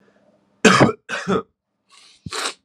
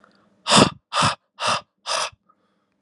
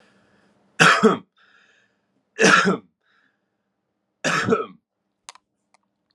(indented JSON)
{
  "cough_length": "2.6 s",
  "cough_amplitude": 32768,
  "cough_signal_mean_std_ratio": 0.36,
  "exhalation_length": "2.8 s",
  "exhalation_amplitude": 32767,
  "exhalation_signal_mean_std_ratio": 0.39,
  "three_cough_length": "6.1 s",
  "three_cough_amplitude": 32662,
  "three_cough_signal_mean_std_ratio": 0.33,
  "survey_phase": "alpha (2021-03-01 to 2021-08-12)",
  "age": "18-44",
  "gender": "Male",
  "wearing_mask": "No",
  "symptom_none": true,
  "smoker_status": "Current smoker (e-cigarettes or vapes only)",
  "respiratory_condition_asthma": false,
  "respiratory_condition_other": false,
  "recruitment_source": "Test and Trace",
  "submission_delay": "1 day",
  "covid_test_result": "Positive",
  "covid_test_method": "LFT"
}